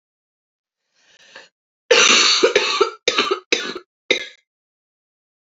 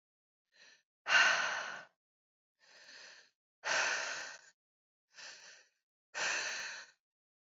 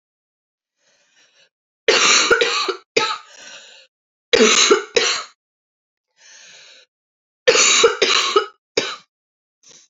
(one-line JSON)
{"cough_length": "5.5 s", "cough_amplitude": 29153, "cough_signal_mean_std_ratio": 0.4, "exhalation_length": "7.6 s", "exhalation_amplitude": 5870, "exhalation_signal_mean_std_ratio": 0.38, "three_cough_length": "9.9 s", "three_cough_amplitude": 30614, "three_cough_signal_mean_std_ratio": 0.43, "survey_phase": "alpha (2021-03-01 to 2021-08-12)", "age": "18-44", "gender": "Female", "wearing_mask": "No", "symptom_cough_any": true, "symptom_fatigue": true, "smoker_status": "Never smoked", "respiratory_condition_asthma": false, "respiratory_condition_other": false, "recruitment_source": "Test and Trace", "submission_delay": "2 days", "covid_test_result": "Positive", "covid_test_method": "RT-qPCR", "covid_ct_value": 21.8, "covid_ct_gene": "ORF1ab gene"}